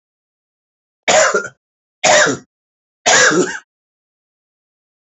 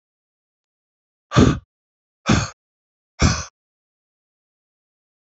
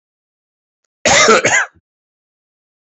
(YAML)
three_cough_length: 5.1 s
three_cough_amplitude: 32768
three_cough_signal_mean_std_ratio: 0.39
exhalation_length: 5.3 s
exhalation_amplitude: 27656
exhalation_signal_mean_std_ratio: 0.25
cough_length: 3.0 s
cough_amplitude: 31016
cough_signal_mean_std_ratio: 0.37
survey_phase: beta (2021-08-13 to 2022-03-07)
age: 45-64
gender: Male
wearing_mask: 'No'
symptom_cough_any: true
symptom_runny_or_blocked_nose: true
smoker_status: Ex-smoker
respiratory_condition_asthma: false
respiratory_condition_other: false
recruitment_source: Test and Trace
submission_delay: 13 days
covid_test_result: Negative
covid_test_method: LFT